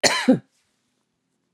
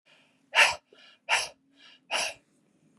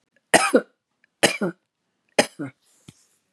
{
  "cough_length": "1.5 s",
  "cough_amplitude": 30311,
  "cough_signal_mean_std_ratio": 0.33,
  "exhalation_length": "3.0 s",
  "exhalation_amplitude": 15727,
  "exhalation_signal_mean_std_ratio": 0.32,
  "three_cough_length": "3.3 s",
  "three_cough_amplitude": 32461,
  "three_cough_signal_mean_std_ratio": 0.28,
  "survey_phase": "beta (2021-08-13 to 2022-03-07)",
  "age": "45-64",
  "gender": "Female",
  "wearing_mask": "No",
  "symptom_runny_or_blocked_nose": true,
  "symptom_sore_throat": true,
  "symptom_headache": true,
  "symptom_onset": "13 days",
  "smoker_status": "Current smoker (1 to 10 cigarettes per day)",
  "respiratory_condition_asthma": false,
  "respiratory_condition_other": false,
  "recruitment_source": "REACT",
  "submission_delay": "3 days",
  "covid_test_result": "Negative",
  "covid_test_method": "RT-qPCR",
  "influenza_a_test_result": "Unknown/Void",
  "influenza_b_test_result": "Unknown/Void"
}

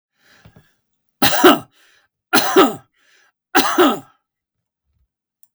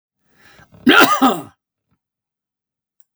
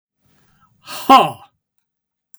{
  "three_cough_length": "5.5 s",
  "three_cough_amplitude": 32768,
  "three_cough_signal_mean_std_ratio": 0.35,
  "cough_length": "3.2 s",
  "cough_amplitude": 32768,
  "cough_signal_mean_std_ratio": 0.32,
  "exhalation_length": "2.4 s",
  "exhalation_amplitude": 32768,
  "exhalation_signal_mean_std_ratio": 0.25,
  "survey_phase": "beta (2021-08-13 to 2022-03-07)",
  "age": "65+",
  "gender": "Male",
  "wearing_mask": "No",
  "symptom_none": true,
  "smoker_status": "Never smoked",
  "respiratory_condition_asthma": false,
  "respiratory_condition_other": false,
  "recruitment_source": "REACT",
  "submission_delay": "2 days",
  "covid_test_result": "Negative",
  "covid_test_method": "RT-qPCR",
  "influenza_a_test_result": "Negative",
  "influenza_b_test_result": "Negative"
}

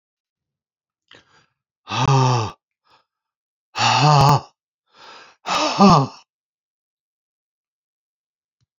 {
  "exhalation_length": "8.8 s",
  "exhalation_amplitude": 27913,
  "exhalation_signal_mean_std_ratio": 0.35,
  "survey_phase": "beta (2021-08-13 to 2022-03-07)",
  "age": "65+",
  "gender": "Male",
  "wearing_mask": "No",
  "symptom_sore_throat": true,
  "smoker_status": "Ex-smoker",
  "respiratory_condition_asthma": false,
  "respiratory_condition_other": false,
  "recruitment_source": "REACT",
  "submission_delay": "3 days",
  "covid_test_result": "Negative",
  "covid_test_method": "RT-qPCR",
  "influenza_a_test_result": "Negative",
  "influenza_b_test_result": "Negative"
}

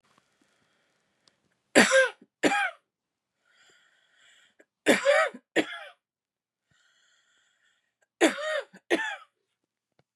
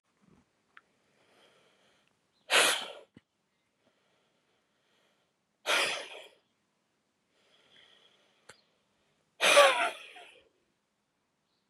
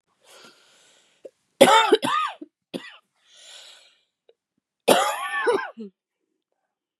{
  "three_cough_length": "10.2 s",
  "three_cough_amplitude": 22765,
  "three_cough_signal_mean_std_ratio": 0.3,
  "exhalation_length": "11.7 s",
  "exhalation_amplitude": 13227,
  "exhalation_signal_mean_std_ratio": 0.24,
  "cough_length": "7.0 s",
  "cough_amplitude": 32398,
  "cough_signal_mean_std_ratio": 0.33,
  "survey_phase": "beta (2021-08-13 to 2022-03-07)",
  "age": "45-64",
  "gender": "Female",
  "wearing_mask": "No",
  "symptom_cough_any": true,
  "symptom_new_continuous_cough": true,
  "symptom_shortness_of_breath": true,
  "symptom_sore_throat": true,
  "symptom_abdominal_pain": true,
  "symptom_diarrhoea": true,
  "symptom_fatigue": true,
  "symptom_headache": true,
  "symptom_change_to_sense_of_smell_or_taste": true,
  "symptom_other": true,
  "symptom_onset": "4 days",
  "smoker_status": "Ex-smoker",
  "respiratory_condition_asthma": false,
  "respiratory_condition_other": false,
  "recruitment_source": "Test and Trace",
  "submission_delay": "2 days",
  "covid_test_result": "Positive",
  "covid_test_method": "RT-qPCR",
  "covid_ct_value": 26.1,
  "covid_ct_gene": "ORF1ab gene"
}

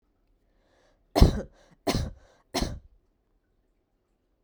{
  "three_cough_length": "4.4 s",
  "three_cough_amplitude": 30674,
  "three_cough_signal_mean_std_ratio": 0.24,
  "survey_phase": "beta (2021-08-13 to 2022-03-07)",
  "age": "18-44",
  "gender": "Female",
  "wearing_mask": "No",
  "symptom_sore_throat": true,
  "symptom_headache": true,
  "smoker_status": "Never smoked",
  "respiratory_condition_asthma": false,
  "respiratory_condition_other": false,
  "recruitment_source": "REACT",
  "submission_delay": "3 days",
  "covid_test_result": "Negative",
  "covid_test_method": "RT-qPCR"
}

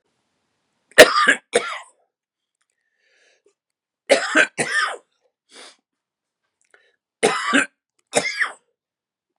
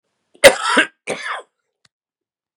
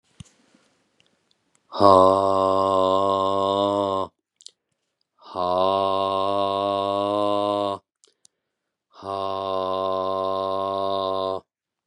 {
  "three_cough_length": "9.4 s",
  "three_cough_amplitude": 32768,
  "three_cough_signal_mean_std_ratio": 0.29,
  "cough_length": "2.6 s",
  "cough_amplitude": 32768,
  "cough_signal_mean_std_ratio": 0.29,
  "exhalation_length": "11.9 s",
  "exhalation_amplitude": 28446,
  "exhalation_signal_mean_std_ratio": 0.57,
  "survey_phase": "beta (2021-08-13 to 2022-03-07)",
  "age": "45-64",
  "gender": "Male",
  "wearing_mask": "No",
  "symptom_cough_any": true,
  "symptom_runny_or_blocked_nose": true,
  "symptom_fatigue": true,
  "symptom_headache": true,
  "symptom_change_to_sense_of_smell_or_taste": true,
  "symptom_loss_of_taste": true,
  "smoker_status": "Never smoked",
  "respiratory_condition_asthma": false,
  "respiratory_condition_other": false,
  "recruitment_source": "Test and Trace",
  "submission_delay": "2 days",
  "covid_test_result": "Positive",
  "covid_test_method": "RT-qPCR",
  "covid_ct_value": 27.1,
  "covid_ct_gene": "ORF1ab gene",
  "covid_ct_mean": 27.5,
  "covid_viral_load": "920 copies/ml",
  "covid_viral_load_category": "Minimal viral load (< 10K copies/ml)"
}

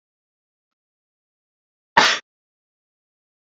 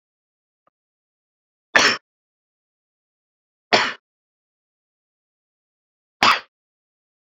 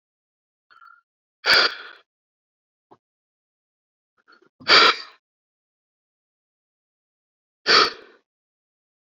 {
  "cough_length": "3.4 s",
  "cough_amplitude": 28417,
  "cough_signal_mean_std_ratio": 0.18,
  "three_cough_length": "7.3 s",
  "three_cough_amplitude": 32768,
  "three_cough_signal_mean_std_ratio": 0.2,
  "exhalation_length": "9.0 s",
  "exhalation_amplitude": 30034,
  "exhalation_signal_mean_std_ratio": 0.23,
  "survey_phase": "beta (2021-08-13 to 2022-03-07)",
  "age": "18-44",
  "gender": "Male",
  "wearing_mask": "No",
  "symptom_cough_any": true,
  "symptom_runny_or_blocked_nose": true,
  "symptom_sore_throat": true,
  "symptom_fatigue": true,
  "smoker_status": "Never smoked",
  "respiratory_condition_asthma": true,
  "respiratory_condition_other": false,
  "recruitment_source": "Test and Trace",
  "submission_delay": "2 days",
  "covid_test_result": "Positive",
  "covid_test_method": "RT-qPCR",
  "covid_ct_value": 26.5,
  "covid_ct_gene": "N gene"
}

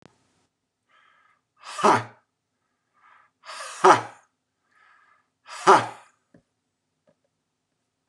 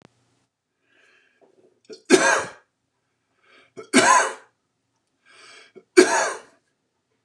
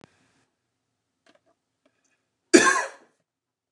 {
  "exhalation_length": "8.1 s",
  "exhalation_amplitude": 28284,
  "exhalation_signal_mean_std_ratio": 0.22,
  "three_cough_length": "7.2 s",
  "three_cough_amplitude": 29203,
  "three_cough_signal_mean_std_ratio": 0.29,
  "cough_length": "3.7 s",
  "cough_amplitude": 28560,
  "cough_signal_mean_std_ratio": 0.2,
  "survey_phase": "beta (2021-08-13 to 2022-03-07)",
  "age": "45-64",
  "gender": "Male",
  "wearing_mask": "No",
  "symptom_prefer_not_to_say": true,
  "smoker_status": "Ex-smoker",
  "respiratory_condition_asthma": false,
  "respiratory_condition_other": false,
  "recruitment_source": "REACT",
  "submission_delay": "2 days",
  "covid_test_result": "Negative",
  "covid_test_method": "RT-qPCR"
}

